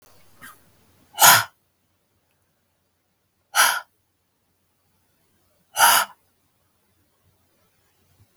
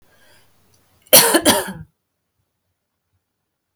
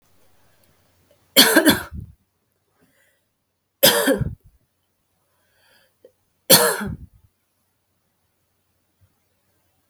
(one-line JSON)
{"exhalation_length": "8.4 s", "exhalation_amplitude": 32768, "exhalation_signal_mean_std_ratio": 0.23, "cough_length": "3.8 s", "cough_amplitude": 32768, "cough_signal_mean_std_ratio": 0.27, "three_cough_length": "9.9 s", "three_cough_amplitude": 32768, "three_cough_signal_mean_std_ratio": 0.26, "survey_phase": "beta (2021-08-13 to 2022-03-07)", "age": "18-44", "gender": "Female", "wearing_mask": "No", "symptom_cough_any": true, "symptom_runny_or_blocked_nose": true, "symptom_shortness_of_breath": true, "symptom_sore_throat": true, "symptom_abdominal_pain": true, "symptom_diarrhoea": true, "symptom_fatigue": true, "symptom_fever_high_temperature": true, "symptom_headache": true, "symptom_change_to_sense_of_smell_or_taste": true, "symptom_onset": "9 days", "smoker_status": "Ex-smoker", "respiratory_condition_asthma": false, "respiratory_condition_other": false, "recruitment_source": "Test and Trace", "submission_delay": "2 days", "covid_test_result": "Positive", "covid_test_method": "RT-qPCR", "covid_ct_value": 14.3, "covid_ct_gene": "ORF1ab gene", "covid_ct_mean": 14.6, "covid_viral_load": "16000000 copies/ml", "covid_viral_load_category": "High viral load (>1M copies/ml)"}